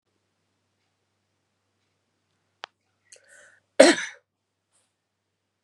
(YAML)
cough_length: 5.6 s
cough_amplitude: 32768
cough_signal_mean_std_ratio: 0.14
survey_phase: beta (2021-08-13 to 2022-03-07)
age: 18-44
gender: Female
wearing_mask: 'No'
symptom_none: true
smoker_status: Ex-smoker
respiratory_condition_asthma: false
respiratory_condition_other: false
recruitment_source: REACT
submission_delay: 1 day
covid_test_result: Negative
covid_test_method: RT-qPCR
influenza_a_test_result: Unknown/Void
influenza_b_test_result: Unknown/Void